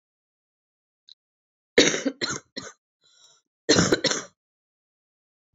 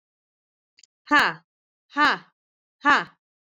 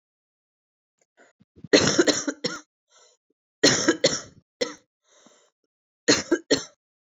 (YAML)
cough_length: 5.5 s
cough_amplitude: 23232
cough_signal_mean_std_ratio: 0.29
exhalation_length: 3.6 s
exhalation_amplitude: 21541
exhalation_signal_mean_std_ratio: 0.29
three_cough_length: 7.1 s
three_cough_amplitude: 25024
three_cough_signal_mean_std_ratio: 0.33
survey_phase: beta (2021-08-13 to 2022-03-07)
age: 18-44
gender: Female
wearing_mask: 'No'
symptom_cough_any: true
symptom_runny_or_blocked_nose: true
symptom_fatigue: true
smoker_status: Ex-smoker
respiratory_condition_asthma: false
respiratory_condition_other: false
recruitment_source: Test and Trace
submission_delay: 2 days
covid_test_result: Positive
covid_test_method: RT-qPCR